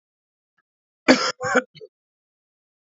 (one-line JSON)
{"cough_length": "3.0 s", "cough_amplitude": 28524, "cough_signal_mean_std_ratio": 0.26, "survey_phase": "beta (2021-08-13 to 2022-03-07)", "age": "18-44", "gender": "Male", "wearing_mask": "No", "symptom_cough_any": true, "symptom_runny_or_blocked_nose": true, "symptom_shortness_of_breath": true, "symptom_sore_throat": true, "symptom_other": true, "symptom_onset": "6 days", "smoker_status": "Current smoker (1 to 10 cigarettes per day)", "respiratory_condition_asthma": false, "respiratory_condition_other": false, "recruitment_source": "Test and Trace", "submission_delay": "3 days", "covid_test_result": "Positive", "covid_test_method": "RT-qPCR", "covid_ct_value": 23.1, "covid_ct_gene": "N gene", "covid_ct_mean": 23.2, "covid_viral_load": "24000 copies/ml", "covid_viral_load_category": "Low viral load (10K-1M copies/ml)"}